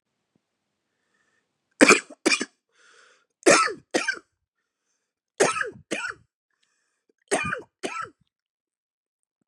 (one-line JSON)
{"cough_length": "9.5 s", "cough_amplitude": 32768, "cough_signal_mean_std_ratio": 0.27, "survey_phase": "beta (2021-08-13 to 2022-03-07)", "age": "45-64", "gender": "Female", "wearing_mask": "No", "symptom_cough_any": true, "symptom_fatigue": true, "symptom_headache": true, "symptom_onset": "6 days", "smoker_status": "Never smoked", "respiratory_condition_asthma": false, "respiratory_condition_other": false, "recruitment_source": "Test and Trace", "submission_delay": "1 day", "covid_test_result": "Positive", "covid_test_method": "RT-qPCR", "covid_ct_value": 21.4, "covid_ct_gene": "ORF1ab gene", "covid_ct_mean": 22.3, "covid_viral_load": "50000 copies/ml", "covid_viral_load_category": "Low viral load (10K-1M copies/ml)"}